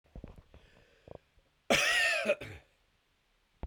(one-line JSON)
{"cough_length": "3.7 s", "cough_amplitude": 6238, "cough_signal_mean_std_ratio": 0.39, "survey_phase": "beta (2021-08-13 to 2022-03-07)", "age": "45-64", "gender": "Male", "wearing_mask": "No", "symptom_diarrhoea": true, "symptom_fatigue": true, "symptom_fever_high_temperature": true, "symptom_headache": true, "symptom_change_to_sense_of_smell_or_taste": true, "smoker_status": "Never smoked", "respiratory_condition_asthma": false, "respiratory_condition_other": false, "recruitment_source": "Test and Trace", "submission_delay": "2 days", "covid_test_result": "Positive", "covid_test_method": "RT-qPCR", "covid_ct_value": 36.0, "covid_ct_gene": "ORF1ab gene", "covid_ct_mean": 36.4, "covid_viral_load": "1.1 copies/ml", "covid_viral_load_category": "Minimal viral load (< 10K copies/ml)"}